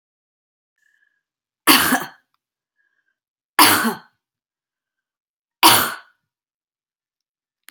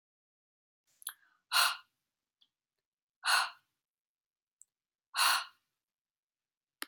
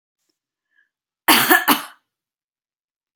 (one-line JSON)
{"three_cough_length": "7.7 s", "three_cough_amplitude": 32768, "three_cough_signal_mean_std_ratio": 0.26, "exhalation_length": "6.9 s", "exhalation_amplitude": 6882, "exhalation_signal_mean_std_ratio": 0.26, "cough_length": "3.2 s", "cough_amplitude": 32768, "cough_signal_mean_std_ratio": 0.29, "survey_phase": "beta (2021-08-13 to 2022-03-07)", "age": "45-64", "gender": "Female", "wearing_mask": "No", "symptom_new_continuous_cough": true, "symptom_runny_or_blocked_nose": true, "symptom_fatigue": true, "symptom_headache": true, "symptom_change_to_sense_of_smell_or_taste": true, "symptom_onset": "2 days", "smoker_status": "Ex-smoker", "respiratory_condition_asthma": false, "respiratory_condition_other": false, "recruitment_source": "Test and Trace", "submission_delay": "1 day", "covid_test_result": "Positive", "covid_test_method": "ePCR"}